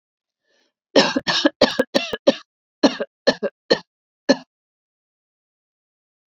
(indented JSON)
{
  "cough_length": "6.4 s",
  "cough_amplitude": 32767,
  "cough_signal_mean_std_ratio": 0.3,
  "survey_phase": "beta (2021-08-13 to 2022-03-07)",
  "age": "65+",
  "gender": "Female",
  "wearing_mask": "No",
  "symptom_none": true,
  "smoker_status": "Never smoked",
  "respiratory_condition_asthma": false,
  "respiratory_condition_other": false,
  "recruitment_source": "REACT",
  "submission_delay": "2 days",
  "covid_test_result": "Negative",
  "covid_test_method": "RT-qPCR",
  "influenza_a_test_result": "Negative",
  "influenza_b_test_result": "Negative"
}